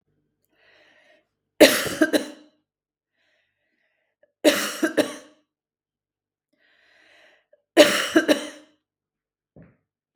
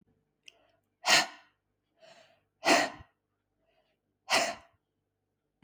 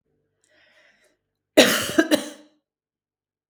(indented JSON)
{
  "three_cough_length": "10.2 s",
  "three_cough_amplitude": 32768,
  "three_cough_signal_mean_std_ratio": 0.26,
  "exhalation_length": "5.6 s",
  "exhalation_amplitude": 12353,
  "exhalation_signal_mean_std_ratio": 0.27,
  "cough_length": "3.5 s",
  "cough_amplitude": 32768,
  "cough_signal_mean_std_ratio": 0.27,
  "survey_phase": "beta (2021-08-13 to 2022-03-07)",
  "age": "45-64",
  "gender": "Female",
  "wearing_mask": "No",
  "symptom_none": true,
  "smoker_status": "Never smoked",
  "respiratory_condition_asthma": false,
  "respiratory_condition_other": false,
  "recruitment_source": "REACT",
  "submission_delay": "1 day",
  "covid_test_result": "Negative",
  "covid_test_method": "RT-qPCR",
  "influenza_a_test_result": "Negative",
  "influenza_b_test_result": "Negative"
}